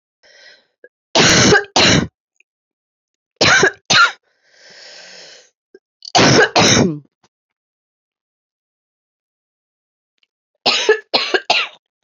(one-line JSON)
{"three_cough_length": "12.0 s", "three_cough_amplitude": 32768, "three_cough_signal_mean_std_ratio": 0.4, "survey_phase": "beta (2021-08-13 to 2022-03-07)", "age": "18-44", "gender": "Female", "wearing_mask": "Yes", "symptom_cough_any": true, "symptom_runny_or_blocked_nose": true, "symptom_shortness_of_breath": true, "symptom_fatigue": true, "symptom_headache": true, "symptom_other": true, "symptom_onset": "5 days", "smoker_status": "Ex-smoker", "respiratory_condition_asthma": true, "respiratory_condition_other": false, "recruitment_source": "Test and Trace", "submission_delay": "3 days", "covid_test_result": "Positive", "covid_test_method": "RT-qPCR", "covid_ct_value": 24.2, "covid_ct_gene": "N gene"}